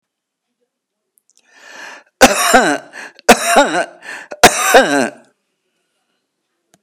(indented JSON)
{
  "three_cough_length": "6.8 s",
  "three_cough_amplitude": 32768,
  "three_cough_signal_mean_std_ratio": 0.38,
  "survey_phase": "beta (2021-08-13 to 2022-03-07)",
  "age": "65+",
  "gender": "Male",
  "wearing_mask": "No",
  "symptom_none": true,
  "smoker_status": "Ex-smoker",
  "respiratory_condition_asthma": true,
  "respiratory_condition_other": false,
  "recruitment_source": "REACT",
  "submission_delay": "2 days",
  "covid_test_result": "Negative",
  "covid_test_method": "RT-qPCR"
}